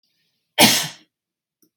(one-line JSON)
{"cough_length": "1.8 s", "cough_amplitude": 32768, "cough_signal_mean_std_ratio": 0.3, "survey_phase": "beta (2021-08-13 to 2022-03-07)", "age": "45-64", "gender": "Female", "wearing_mask": "No", "symptom_none": true, "smoker_status": "Never smoked", "respiratory_condition_asthma": false, "respiratory_condition_other": false, "recruitment_source": "REACT", "submission_delay": "8 days", "covid_test_result": "Negative", "covid_test_method": "RT-qPCR", "influenza_a_test_result": "Negative", "influenza_b_test_result": "Negative"}